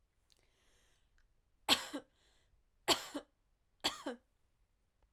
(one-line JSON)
{"three_cough_length": "5.1 s", "three_cough_amplitude": 6111, "three_cough_signal_mean_std_ratio": 0.24, "survey_phase": "alpha (2021-03-01 to 2021-08-12)", "age": "18-44", "gender": "Female", "wearing_mask": "No", "symptom_cough_any": true, "symptom_fatigue": true, "symptom_fever_high_temperature": true, "symptom_headache": true, "smoker_status": "Never smoked", "respiratory_condition_asthma": false, "respiratory_condition_other": false, "recruitment_source": "Test and Trace", "submission_delay": "2 days", "covid_test_result": "Positive", "covid_test_method": "LFT"}